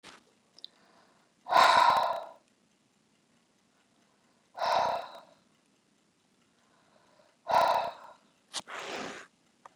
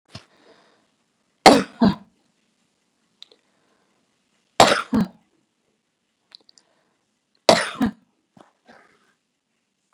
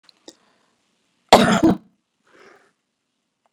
{
  "exhalation_length": "9.8 s",
  "exhalation_amplitude": 11744,
  "exhalation_signal_mean_std_ratio": 0.33,
  "three_cough_length": "9.9 s",
  "three_cough_amplitude": 32768,
  "three_cough_signal_mean_std_ratio": 0.21,
  "cough_length": "3.5 s",
  "cough_amplitude": 32768,
  "cough_signal_mean_std_ratio": 0.25,
  "survey_phase": "beta (2021-08-13 to 2022-03-07)",
  "age": "65+",
  "gender": "Female",
  "wearing_mask": "No",
  "symptom_none": true,
  "smoker_status": "Current smoker (1 to 10 cigarettes per day)",
  "respiratory_condition_asthma": false,
  "respiratory_condition_other": false,
  "recruitment_source": "REACT",
  "submission_delay": "16 days",
  "covid_test_result": "Negative",
  "covid_test_method": "RT-qPCR"
}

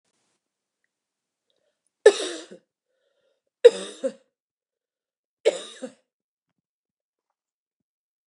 {
  "three_cough_length": "8.3 s",
  "three_cough_amplitude": 28831,
  "three_cough_signal_mean_std_ratio": 0.15,
  "survey_phase": "beta (2021-08-13 to 2022-03-07)",
  "age": "45-64",
  "gender": "Female",
  "wearing_mask": "No",
  "symptom_cough_any": true,
  "symptom_runny_or_blocked_nose": true,
  "symptom_headache": true,
  "smoker_status": "Never smoked",
  "respiratory_condition_asthma": false,
  "respiratory_condition_other": false,
  "recruitment_source": "Test and Trace",
  "submission_delay": "2 days",
  "covid_test_result": "Positive",
  "covid_test_method": "RT-qPCR"
}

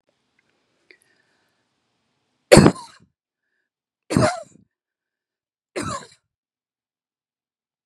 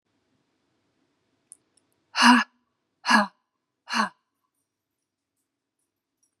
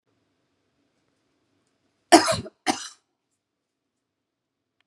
{
  "three_cough_length": "7.9 s",
  "three_cough_amplitude": 32768,
  "three_cough_signal_mean_std_ratio": 0.18,
  "exhalation_length": "6.4 s",
  "exhalation_amplitude": 21950,
  "exhalation_signal_mean_std_ratio": 0.23,
  "cough_length": "4.9 s",
  "cough_amplitude": 32767,
  "cough_signal_mean_std_ratio": 0.18,
  "survey_phase": "beta (2021-08-13 to 2022-03-07)",
  "age": "45-64",
  "gender": "Female",
  "wearing_mask": "No",
  "symptom_none": true,
  "smoker_status": "Ex-smoker",
  "respiratory_condition_asthma": false,
  "respiratory_condition_other": false,
  "recruitment_source": "REACT",
  "submission_delay": "1 day",
  "covid_test_result": "Negative",
  "covid_test_method": "RT-qPCR"
}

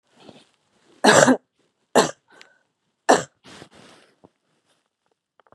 {
  "three_cough_length": "5.5 s",
  "three_cough_amplitude": 32768,
  "three_cough_signal_mean_std_ratio": 0.25,
  "survey_phase": "beta (2021-08-13 to 2022-03-07)",
  "age": "45-64",
  "gender": "Female",
  "wearing_mask": "No",
  "symptom_cough_any": true,
  "symptom_runny_or_blocked_nose": true,
  "symptom_sore_throat": true,
  "symptom_abdominal_pain": true,
  "symptom_fatigue": true,
  "symptom_headache": true,
  "smoker_status": "Ex-smoker",
  "respiratory_condition_asthma": false,
  "respiratory_condition_other": false,
  "recruitment_source": "Test and Trace",
  "submission_delay": "2 days",
  "covid_test_result": "Positive",
  "covid_test_method": "LFT"
}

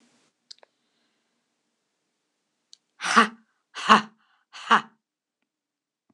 {
  "exhalation_length": "6.1 s",
  "exhalation_amplitude": 26028,
  "exhalation_signal_mean_std_ratio": 0.21,
  "survey_phase": "beta (2021-08-13 to 2022-03-07)",
  "age": "65+",
  "gender": "Female",
  "wearing_mask": "No",
  "symptom_none": true,
  "smoker_status": "Ex-smoker",
  "respiratory_condition_asthma": false,
  "respiratory_condition_other": false,
  "recruitment_source": "REACT",
  "submission_delay": "2 days",
  "covid_test_result": "Negative",
  "covid_test_method": "RT-qPCR",
  "influenza_a_test_result": "Negative",
  "influenza_b_test_result": "Negative"
}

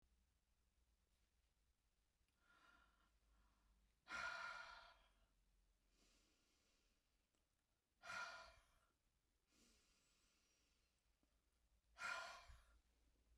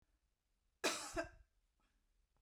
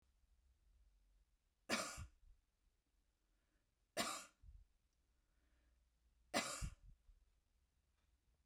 {
  "exhalation_length": "13.4 s",
  "exhalation_amplitude": 413,
  "exhalation_signal_mean_std_ratio": 0.35,
  "cough_length": "2.4 s",
  "cough_amplitude": 2189,
  "cough_signal_mean_std_ratio": 0.31,
  "three_cough_length": "8.5 s",
  "three_cough_amplitude": 1764,
  "three_cough_signal_mean_std_ratio": 0.3,
  "survey_phase": "beta (2021-08-13 to 2022-03-07)",
  "age": "45-64",
  "gender": "Female",
  "wearing_mask": "No",
  "symptom_sore_throat": true,
  "symptom_other": true,
  "smoker_status": "Never smoked",
  "respiratory_condition_asthma": false,
  "respiratory_condition_other": false,
  "recruitment_source": "Test and Trace",
  "submission_delay": "1 day",
  "covid_test_result": "Negative",
  "covid_test_method": "RT-qPCR"
}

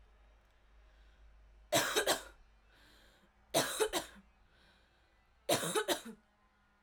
{
  "three_cough_length": "6.8 s",
  "three_cough_amplitude": 5389,
  "three_cough_signal_mean_std_ratio": 0.38,
  "survey_phase": "alpha (2021-03-01 to 2021-08-12)",
  "age": "18-44",
  "gender": "Female",
  "wearing_mask": "No",
  "symptom_none": true,
  "smoker_status": "Never smoked",
  "respiratory_condition_asthma": false,
  "respiratory_condition_other": false,
  "recruitment_source": "REACT",
  "submission_delay": "3 days",
  "covid_test_result": "Negative",
  "covid_test_method": "RT-qPCR"
}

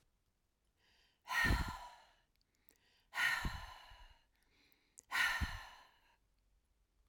{
  "exhalation_length": "7.1 s",
  "exhalation_amplitude": 2715,
  "exhalation_signal_mean_std_ratio": 0.38,
  "survey_phase": "alpha (2021-03-01 to 2021-08-12)",
  "age": "65+",
  "gender": "Female",
  "wearing_mask": "No",
  "symptom_none": true,
  "smoker_status": "Never smoked",
  "respiratory_condition_asthma": false,
  "respiratory_condition_other": false,
  "recruitment_source": "REACT",
  "submission_delay": "1 day",
  "covid_test_result": "Negative",
  "covid_test_method": "RT-qPCR"
}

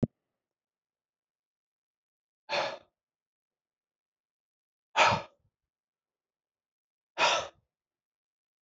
{
  "exhalation_length": "8.6 s",
  "exhalation_amplitude": 10460,
  "exhalation_signal_mean_std_ratio": 0.22,
  "survey_phase": "beta (2021-08-13 to 2022-03-07)",
  "age": "65+",
  "gender": "Male",
  "wearing_mask": "No",
  "symptom_none": true,
  "smoker_status": "Never smoked",
  "respiratory_condition_asthma": false,
  "respiratory_condition_other": false,
  "recruitment_source": "REACT",
  "submission_delay": "3 days",
  "covid_test_result": "Negative",
  "covid_test_method": "RT-qPCR"
}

